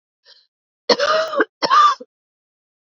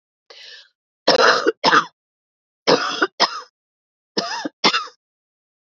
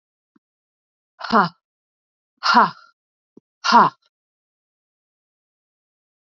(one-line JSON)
{"cough_length": "2.8 s", "cough_amplitude": 27987, "cough_signal_mean_std_ratio": 0.43, "three_cough_length": "5.6 s", "three_cough_amplitude": 32732, "three_cough_signal_mean_std_ratio": 0.39, "exhalation_length": "6.2 s", "exhalation_amplitude": 27641, "exhalation_signal_mean_std_ratio": 0.25, "survey_phase": "beta (2021-08-13 to 2022-03-07)", "age": "45-64", "gender": "Female", "wearing_mask": "No", "symptom_cough_any": true, "symptom_runny_or_blocked_nose": true, "symptom_sore_throat": true, "symptom_fatigue": true, "symptom_change_to_sense_of_smell_or_taste": true, "symptom_onset": "5 days", "smoker_status": "Never smoked", "respiratory_condition_asthma": false, "respiratory_condition_other": false, "recruitment_source": "Test and Trace", "submission_delay": "2 days", "covid_test_result": "Positive", "covid_test_method": "RT-qPCR", "covid_ct_value": 23.0, "covid_ct_gene": "ORF1ab gene", "covid_ct_mean": 23.9, "covid_viral_load": "14000 copies/ml", "covid_viral_load_category": "Low viral load (10K-1M copies/ml)"}